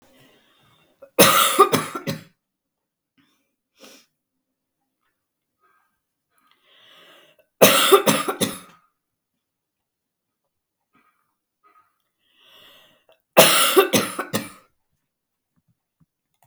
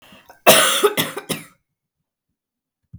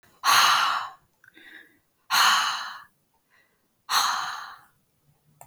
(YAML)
three_cough_length: 16.5 s
three_cough_amplitude: 32768
three_cough_signal_mean_std_ratio: 0.27
cough_length: 3.0 s
cough_amplitude: 32768
cough_signal_mean_std_ratio: 0.35
exhalation_length: 5.5 s
exhalation_amplitude: 15894
exhalation_signal_mean_std_ratio: 0.45
survey_phase: beta (2021-08-13 to 2022-03-07)
age: 18-44
gender: Female
wearing_mask: 'No'
symptom_cough_any: true
symptom_fatigue: true
smoker_status: Never smoked
respiratory_condition_asthma: false
respiratory_condition_other: false
recruitment_source: Test and Trace
submission_delay: 2 days
covid_test_result: Positive
covid_test_method: ePCR